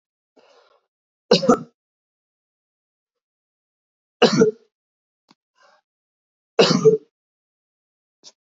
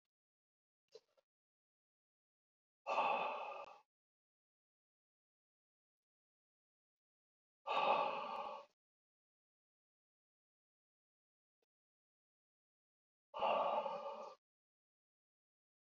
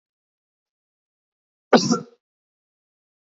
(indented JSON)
{
  "three_cough_length": "8.5 s",
  "three_cough_amplitude": 26714,
  "three_cough_signal_mean_std_ratio": 0.24,
  "exhalation_length": "16.0 s",
  "exhalation_amplitude": 2344,
  "exhalation_signal_mean_std_ratio": 0.3,
  "cough_length": "3.2 s",
  "cough_amplitude": 26736,
  "cough_signal_mean_std_ratio": 0.19,
  "survey_phase": "beta (2021-08-13 to 2022-03-07)",
  "age": "45-64",
  "gender": "Male",
  "wearing_mask": "No",
  "symptom_cough_any": true,
  "symptom_runny_or_blocked_nose": true,
  "symptom_change_to_sense_of_smell_or_taste": true,
  "symptom_onset": "4 days",
  "smoker_status": "Never smoked",
  "respiratory_condition_asthma": false,
  "respiratory_condition_other": false,
  "recruitment_source": "Test and Trace",
  "submission_delay": "1 day",
  "covid_test_result": "Positive",
  "covid_test_method": "RT-qPCR",
  "covid_ct_value": 16.2,
  "covid_ct_gene": "ORF1ab gene",
  "covid_ct_mean": 16.6,
  "covid_viral_load": "3500000 copies/ml",
  "covid_viral_load_category": "High viral load (>1M copies/ml)"
}